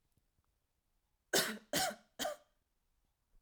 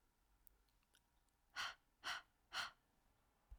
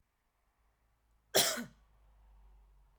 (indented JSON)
{
  "three_cough_length": "3.4 s",
  "three_cough_amplitude": 4948,
  "three_cough_signal_mean_std_ratio": 0.32,
  "exhalation_length": "3.6 s",
  "exhalation_amplitude": 802,
  "exhalation_signal_mean_std_ratio": 0.35,
  "cough_length": "3.0 s",
  "cough_amplitude": 7468,
  "cough_signal_mean_std_ratio": 0.25,
  "survey_phase": "beta (2021-08-13 to 2022-03-07)",
  "age": "18-44",
  "gender": "Female",
  "wearing_mask": "No",
  "symptom_none": true,
  "smoker_status": "Never smoked",
  "respiratory_condition_asthma": false,
  "respiratory_condition_other": false,
  "recruitment_source": "REACT",
  "submission_delay": "1 day",
  "covid_test_result": "Negative",
  "covid_test_method": "RT-qPCR",
  "influenza_a_test_result": "Negative",
  "influenza_b_test_result": "Negative"
}